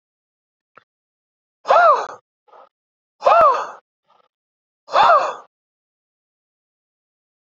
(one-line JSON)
{"exhalation_length": "7.5 s", "exhalation_amplitude": 27354, "exhalation_signal_mean_std_ratio": 0.32, "survey_phase": "beta (2021-08-13 to 2022-03-07)", "age": "45-64", "gender": "Male", "wearing_mask": "No", "symptom_sore_throat": true, "smoker_status": "Ex-smoker", "respiratory_condition_asthma": false, "respiratory_condition_other": false, "recruitment_source": "Test and Trace", "submission_delay": "2 days", "covid_test_result": "Positive", "covid_test_method": "ePCR"}